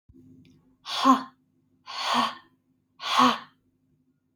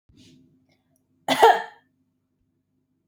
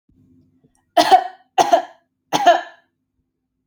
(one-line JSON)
{"exhalation_length": "4.4 s", "exhalation_amplitude": 15904, "exhalation_signal_mean_std_ratio": 0.37, "cough_length": "3.1 s", "cough_amplitude": 27416, "cough_signal_mean_std_ratio": 0.23, "three_cough_length": "3.7 s", "three_cough_amplitude": 32283, "three_cough_signal_mean_std_ratio": 0.34, "survey_phase": "beta (2021-08-13 to 2022-03-07)", "age": "18-44", "gender": "Female", "wearing_mask": "No", "symptom_none": true, "smoker_status": "Never smoked", "respiratory_condition_asthma": false, "respiratory_condition_other": false, "recruitment_source": "REACT", "submission_delay": "1 day", "covid_test_result": "Negative", "covid_test_method": "RT-qPCR"}